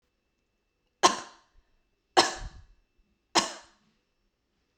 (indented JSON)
{
  "three_cough_length": "4.8 s",
  "three_cough_amplitude": 18700,
  "three_cough_signal_mean_std_ratio": 0.22,
  "survey_phase": "beta (2021-08-13 to 2022-03-07)",
  "age": "45-64",
  "gender": "Female",
  "wearing_mask": "No",
  "symptom_none": true,
  "smoker_status": "Never smoked",
  "respiratory_condition_asthma": false,
  "respiratory_condition_other": false,
  "recruitment_source": "REACT",
  "submission_delay": "-1 day",
  "covid_test_result": "Negative",
  "covid_test_method": "RT-qPCR"
}